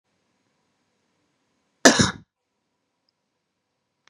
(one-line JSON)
{"cough_length": "4.1 s", "cough_amplitude": 32767, "cough_signal_mean_std_ratio": 0.17, "survey_phase": "beta (2021-08-13 to 2022-03-07)", "age": "18-44", "gender": "Female", "wearing_mask": "No", "symptom_fatigue": true, "symptom_headache": true, "symptom_change_to_sense_of_smell_or_taste": true, "symptom_onset": "2 days", "smoker_status": "Current smoker (1 to 10 cigarettes per day)", "respiratory_condition_asthma": false, "respiratory_condition_other": false, "recruitment_source": "Test and Trace", "submission_delay": "2 days", "covid_test_result": "Positive", "covid_test_method": "RT-qPCR", "covid_ct_value": 33.1, "covid_ct_gene": "N gene"}